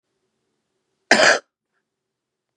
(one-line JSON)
{"cough_length": "2.6 s", "cough_amplitude": 32767, "cough_signal_mean_std_ratio": 0.25, "survey_phase": "beta (2021-08-13 to 2022-03-07)", "age": "18-44", "gender": "Female", "wearing_mask": "No", "symptom_cough_any": true, "symptom_runny_or_blocked_nose": true, "symptom_headache": true, "symptom_onset": "13 days", "smoker_status": "Current smoker (11 or more cigarettes per day)", "respiratory_condition_asthma": false, "respiratory_condition_other": false, "recruitment_source": "REACT", "submission_delay": "4 days", "covid_test_result": "Negative", "covid_test_method": "RT-qPCR", "influenza_a_test_result": "Negative", "influenza_b_test_result": "Negative"}